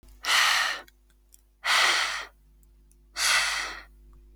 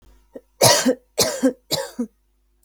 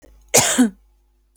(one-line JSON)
{"exhalation_length": "4.4 s", "exhalation_amplitude": 10953, "exhalation_signal_mean_std_ratio": 0.55, "three_cough_length": "2.6 s", "three_cough_amplitude": 31259, "three_cough_signal_mean_std_ratio": 0.43, "cough_length": "1.4 s", "cough_amplitude": 32768, "cough_signal_mean_std_ratio": 0.42, "survey_phase": "beta (2021-08-13 to 2022-03-07)", "age": "18-44", "gender": "Female", "wearing_mask": "No", "symptom_none": true, "symptom_onset": "11 days", "smoker_status": "Never smoked", "respiratory_condition_asthma": false, "respiratory_condition_other": false, "recruitment_source": "REACT", "submission_delay": "3 days", "covid_test_result": "Negative", "covid_test_method": "RT-qPCR"}